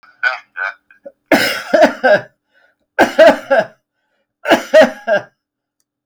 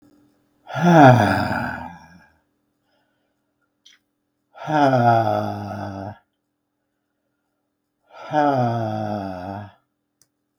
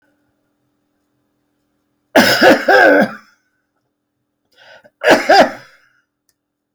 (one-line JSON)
{"three_cough_length": "6.1 s", "three_cough_amplitude": 32768, "three_cough_signal_mean_std_ratio": 0.43, "exhalation_length": "10.6 s", "exhalation_amplitude": 32768, "exhalation_signal_mean_std_ratio": 0.41, "cough_length": "6.7 s", "cough_amplitude": 32768, "cough_signal_mean_std_ratio": 0.36, "survey_phase": "beta (2021-08-13 to 2022-03-07)", "age": "65+", "gender": "Male", "wearing_mask": "No", "symptom_none": true, "smoker_status": "Never smoked", "respiratory_condition_asthma": false, "respiratory_condition_other": false, "recruitment_source": "REACT", "submission_delay": "2 days", "covid_test_result": "Negative", "covid_test_method": "RT-qPCR", "influenza_a_test_result": "Negative", "influenza_b_test_result": "Negative"}